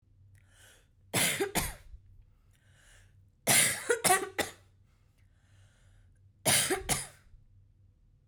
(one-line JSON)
{"three_cough_length": "8.3 s", "three_cough_amplitude": 10074, "three_cough_signal_mean_std_ratio": 0.38, "survey_phase": "beta (2021-08-13 to 2022-03-07)", "age": "18-44", "gender": "Female", "wearing_mask": "No", "symptom_none": true, "smoker_status": "Never smoked", "respiratory_condition_asthma": false, "respiratory_condition_other": false, "recruitment_source": "REACT", "submission_delay": "0 days", "covid_test_result": "Negative", "covid_test_method": "RT-qPCR"}